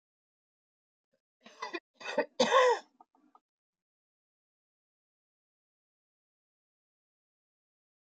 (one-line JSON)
{"cough_length": "8.0 s", "cough_amplitude": 7247, "cough_signal_mean_std_ratio": 0.21, "survey_phase": "beta (2021-08-13 to 2022-03-07)", "age": "65+", "gender": "Female", "wearing_mask": "No", "symptom_none": true, "smoker_status": "Current smoker (1 to 10 cigarettes per day)", "respiratory_condition_asthma": false, "respiratory_condition_other": false, "recruitment_source": "REACT", "submission_delay": "4 days", "covid_test_result": "Negative", "covid_test_method": "RT-qPCR", "influenza_a_test_result": "Unknown/Void", "influenza_b_test_result": "Unknown/Void"}